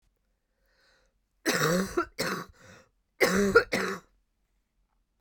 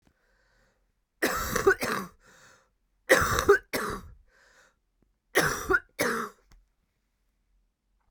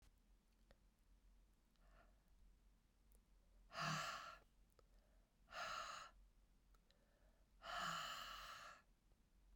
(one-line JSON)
{"cough_length": "5.2 s", "cough_amplitude": 16530, "cough_signal_mean_std_ratio": 0.39, "three_cough_length": "8.1 s", "three_cough_amplitude": 17700, "three_cough_signal_mean_std_ratio": 0.37, "exhalation_length": "9.6 s", "exhalation_amplitude": 596, "exhalation_signal_mean_std_ratio": 0.49, "survey_phase": "beta (2021-08-13 to 2022-03-07)", "age": "45-64", "gender": "Female", "wearing_mask": "No", "symptom_cough_any": true, "symptom_runny_or_blocked_nose": true, "symptom_sore_throat": true, "symptom_fatigue": true, "symptom_change_to_sense_of_smell_or_taste": true, "symptom_onset": "5 days", "smoker_status": "Ex-smoker", "respiratory_condition_asthma": false, "respiratory_condition_other": false, "recruitment_source": "Test and Trace", "submission_delay": "2 days", "covid_test_result": "Positive", "covid_test_method": "RT-qPCR", "covid_ct_value": 16.2, "covid_ct_gene": "ORF1ab gene", "covid_ct_mean": 16.3, "covid_viral_load": "4500000 copies/ml", "covid_viral_load_category": "High viral load (>1M copies/ml)"}